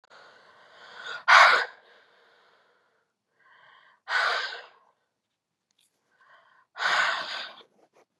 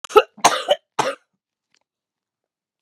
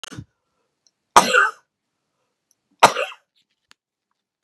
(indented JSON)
{
  "exhalation_length": "8.2 s",
  "exhalation_amplitude": 23581,
  "exhalation_signal_mean_std_ratio": 0.3,
  "cough_length": "2.8 s",
  "cough_amplitude": 32768,
  "cough_signal_mean_std_ratio": 0.26,
  "three_cough_length": "4.4 s",
  "three_cough_amplitude": 32768,
  "three_cough_signal_mean_std_ratio": 0.23,
  "survey_phase": "beta (2021-08-13 to 2022-03-07)",
  "age": "45-64",
  "gender": "Female",
  "wearing_mask": "No",
  "symptom_new_continuous_cough": true,
  "symptom_runny_or_blocked_nose": true,
  "symptom_sore_throat": true,
  "symptom_abdominal_pain": true,
  "symptom_fatigue": true,
  "symptom_fever_high_temperature": true,
  "symptom_onset": "6 days",
  "smoker_status": "Never smoked",
  "respiratory_condition_asthma": true,
  "respiratory_condition_other": false,
  "recruitment_source": "Test and Trace",
  "submission_delay": "2 days",
  "covid_test_result": "Positive",
  "covid_test_method": "RT-qPCR",
  "covid_ct_value": 23.8,
  "covid_ct_gene": "N gene"
}